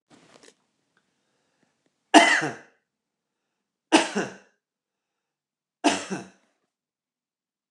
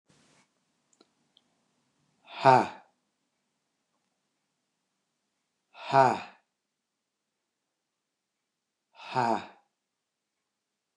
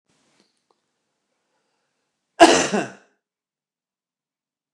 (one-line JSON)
{"three_cough_length": "7.7 s", "three_cough_amplitude": 29204, "three_cough_signal_mean_std_ratio": 0.23, "exhalation_length": "11.0 s", "exhalation_amplitude": 16147, "exhalation_signal_mean_std_ratio": 0.19, "cough_length": "4.7 s", "cough_amplitude": 29204, "cough_signal_mean_std_ratio": 0.2, "survey_phase": "alpha (2021-03-01 to 2021-08-12)", "age": "45-64", "gender": "Male", "wearing_mask": "No", "symptom_none": true, "smoker_status": "Ex-smoker", "respiratory_condition_asthma": false, "respiratory_condition_other": false, "recruitment_source": "REACT", "submission_delay": "1 day", "covid_test_result": "Negative", "covid_test_method": "RT-qPCR"}